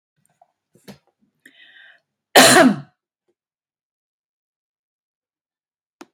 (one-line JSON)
{"cough_length": "6.1 s", "cough_amplitude": 32768, "cough_signal_mean_std_ratio": 0.21, "survey_phase": "beta (2021-08-13 to 2022-03-07)", "age": "45-64", "gender": "Female", "wearing_mask": "No", "symptom_none": true, "smoker_status": "Ex-smoker", "respiratory_condition_asthma": false, "respiratory_condition_other": false, "recruitment_source": "REACT", "submission_delay": "0 days", "covid_test_result": "Negative", "covid_test_method": "RT-qPCR", "influenza_a_test_result": "Negative", "influenza_b_test_result": "Negative"}